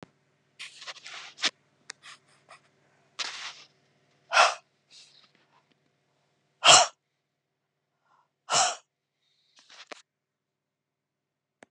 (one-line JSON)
{"exhalation_length": "11.7 s", "exhalation_amplitude": 29614, "exhalation_signal_mean_std_ratio": 0.21, "survey_phase": "beta (2021-08-13 to 2022-03-07)", "age": "65+", "gender": "Female", "wearing_mask": "No", "symptom_none": true, "smoker_status": "Ex-smoker", "respiratory_condition_asthma": false, "respiratory_condition_other": false, "recruitment_source": "REACT", "submission_delay": "7 days", "covid_test_result": "Negative", "covid_test_method": "RT-qPCR", "influenza_a_test_result": "Negative", "influenza_b_test_result": "Negative"}